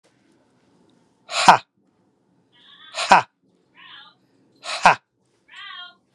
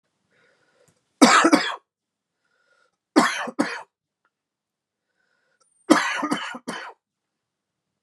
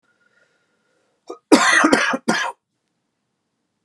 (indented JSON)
{
  "exhalation_length": "6.1 s",
  "exhalation_amplitude": 32768,
  "exhalation_signal_mean_std_ratio": 0.22,
  "three_cough_length": "8.0 s",
  "three_cough_amplitude": 32767,
  "three_cough_signal_mean_std_ratio": 0.3,
  "cough_length": "3.8 s",
  "cough_amplitude": 32768,
  "cough_signal_mean_std_ratio": 0.36,
  "survey_phase": "beta (2021-08-13 to 2022-03-07)",
  "age": "45-64",
  "gender": "Male",
  "wearing_mask": "No",
  "symptom_cough_any": true,
  "symptom_new_continuous_cough": true,
  "symptom_shortness_of_breath": true,
  "symptom_headache": true,
  "smoker_status": "Never smoked",
  "respiratory_condition_asthma": true,
  "respiratory_condition_other": false,
  "recruitment_source": "Test and Trace",
  "submission_delay": "3 days",
  "covid_test_result": "Positive",
  "covid_test_method": "RT-qPCR",
  "covid_ct_value": 18.1,
  "covid_ct_gene": "S gene"
}